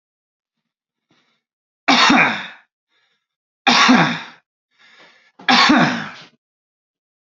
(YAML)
three_cough_length: 7.3 s
three_cough_amplitude: 32767
three_cough_signal_mean_std_ratio: 0.38
survey_phase: alpha (2021-03-01 to 2021-08-12)
age: 18-44
gender: Male
wearing_mask: 'No'
symptom_none: true
smoker_status: Never smoked
respiratory_condition_asthma: false
respiratory_condition_other: false
recruitment_source: REACT
submission_delay: 2 days
covid_test_result: Negative
covid_test_method: RT-qPCR